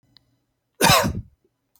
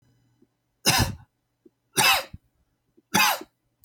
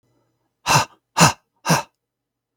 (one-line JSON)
{"cough_length": "1.8 s", "cough_amplitude": 23805, "cough_signal_mean_std_ratio": 0.35, "three_cough_length": "3.8 s", "three_cough_amplitude": 18347, "three_cough_signal_mean_std_ratio": 0.36, "exhalation_length": "2.6 s", "exhalation_amplitude": 32766, "exhalation_signal_mean_std_ratio": 0.33, "survey_phase": "beta (2021-08-13 to 2022-03-07)", "age": "45-64", "gender": "Male", "wearing_mask": "No", "symptom_none": true, "symptom_onset": "6 days", "smoker_status": "Never smoked", "respiratory_condition_asthma": false, "respiratory_condition_other": false, "recruitment_source": "REACT", "submission_delay": "1 day", "covid_test_result": "Negative", "covid_test_method": "RT-qPCR", "influenza_a_test_result": "Negative", "influenza_b_test_result": "Negative"}